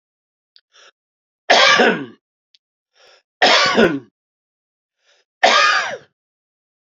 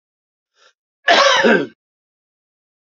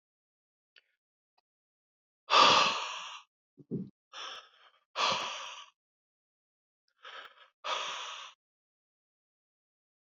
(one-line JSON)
{"three_cough_length": "7.0 s", "three_cough_amplitude": 30428, "three_cough_signal_mean_std_ratio": 0.38, "cough_length": "2.8 s", "cough_amplitude": 30167, "cough_signal_mean_std_ratio": 0.37, "exhalation_length": "10.2 s", "exhalation_amplitude": 10828, "exhalation_signal_mean_std_ratio": 0.29, "survey_phase": "beta (2021-08-13 to 2022-03-07)", "age": "45-64", "gender": "Male", "wearing_mask": "No", "symptom_none": true, "smoker_status": "Ex-smoker", "respiratory_condition_asthma": false, "respiratory_condition_other": false, "recruitment_source": "REACT", "submission_delay": "2 days", "covid_test_result": "Negative", "covid_test_method": "RT-qPCR", "influenza_a_test_result": "Unknown/Void", "influenza_b_test_result": "Unknown/Void"}